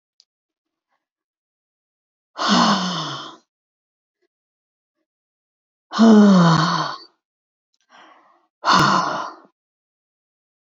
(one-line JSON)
{"exhalation_length": "10.7 s", "exhalation_amplitude": 25903, "exhalation_signal_mean_std_ratio": 0.36, "survey_phase": "beta (2021-08-13 to 2022-03-07)", "age": "65+", "gender": "Female", "wearing_mask": "No", "symptom_change_to_sense_of_smell_or_taste": true, "symptom_loss_of_taste": true, "smoker_status": "Never smoked", "respiratory_condition_asthma": false, "respiratory_condition_other": true, "recruitment_source": "REACT", "submission_delay": "2 days", "covid_test_result": "Negative", "covid_test_method": "RT-qPCR", "influenza_a_test_result": "Negative", "influenza_b_test_result": "Negative"}